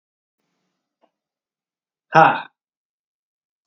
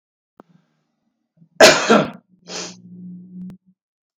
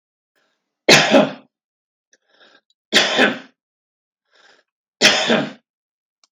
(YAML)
exhalation_length: 3.7 s
exhalation_amplitude: 32768
exhalation_signal_mean_std_ratio: 0.19
cough_length: 4.2 s
cough_amplitude: 32768
cough_signal_mean_std_ratio: 0.28
three_cough_length: 6.3 s
three_cough_amplitude: 32768
three_cough_signal_mean_std_ratio: 0.34
survey_phase: beta (2021-08-13 to 2022-03-07)
age: 45-64
gender: Male
wearing_mask: 'No'
symptom_none: true
smoker_status: Current smoker (1 to 10 cigarettes per day)
respiratory_condition_asthma: false
respiratory_condition_other: false
recruitment_source: REACT
submission_delay: 10 days
covid_test_result: Negative
covid_test_method: RT-qPCR